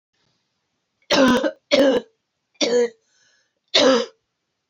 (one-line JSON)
{"three_cough_length": "4.7 s", "three_cough_amplitude": 28053, "three_cough_signal_mean_std_ratio": 0.45, "survey_phase": "beta (2021-08-13 to 2022-03-07)", "age": "18-44", "gender": "Female", "wearing_mask": "No", "symptom_cough_any": true, "symptom_runny_or_blocked_nose": true, "symptom_shortness_of_breath": true, "symptom_fatigue": true, "symptom_headache": true, "smoker_status": "Never smoked", "respiratory_condition_asthma": false, "respiratory_condition_other": false, "recruitment_source": "Test and Trace", "submission_delay": "3 days", "covid_test_result": "Positive", "covid_test_method": "RT-qPCR", "covid_ct_value": 17.3, "covid_ct_gene": "N gene"}